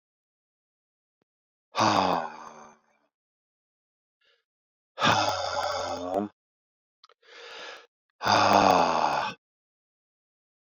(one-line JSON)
{"exhalation_length": "10.8 s", "exhalation_amplitude": 16142, "exhalation_signal_mean_std_ratio": 0.4, "survey_phase": "beta (2021-08-13 to 2022-03-07)", "age": "45-64", "gender": "Male", "wearing_mask": "No", "symptom_cough_any": true, "symptom_runny_or_blocked_nose": true, "symptom_fatigue": true, "symptom_headache": true, "symptom_change_to_sense_of_smell_or_taste": true, "symptom_loss_of_taste": true, "symptom_onset": "3 days", "smoker_status": "Never smoked", "respiratory_condition_asthma": false, "respiratory_condition_other": false, "recruitment_source": "Test and Trace", "submission_delay": "1 day", "covid_test_result": "Positive", "covid_test_method": "RT-qPCR"}